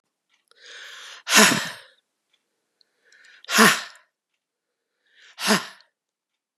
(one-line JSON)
{"exhalation_length": "6.6 s", "exhalation_amplitude": 31862, "exhalation_signal_mean_std_ratio": 0.28, "survey_phase": "beta (2021-08-13 to 2022-03-07)", "age": "18-44", "gender": "Female", "wearing_mask": "No", "symptom_fatigue": true, "smoker_status": "Ex-smoker", "respiratory_condition_asthma": true, "respiratory_condition_other": false, "recruitment_source": "REACT", "submission_delay": "2 days", "covid_test_result": "Negative", "covid_test_method": "RT-qPCR", "influenza_a_test_result": "Negative", "influenza_b_test_result": "Negative"}